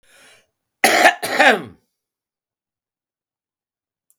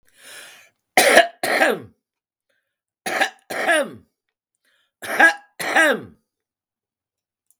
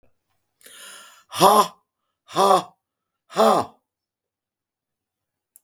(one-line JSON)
{"cough_length": "4.2 s", "cough_amplitude": 32768, "cough_signal_mean_std_ratio": 0.29, "three_cough_length": "7.6 s", "three_cough_amplitude": 32768, "three_cough_signal_mean_std_ratio": 0.37, "exhalation_length": "5.6 s", "exhalation_amplitude": 32768, "exhalation_signal_mean_std_ratio": 0.3, "survey_phase": "beta (2021-08-13 to 2022-03-07)", "age": "65+", "gender": "Female", "wearing_mask": "No", "symptom_cough_any": true, "smoker_status": "Current smoker (1 to 10 cigarettes per day)", "respiratory_condition_asthma": false, "respiratory_condition_other": false, "recruitment_source": "REACT", "submission_delay": "7 days", "covid_test_result": "Negative", "covid_test_method": "RT-qPCR", "influenza_a_test_result": "Unknown/Void", "influenza_b_test_result": "Unknown/Void"}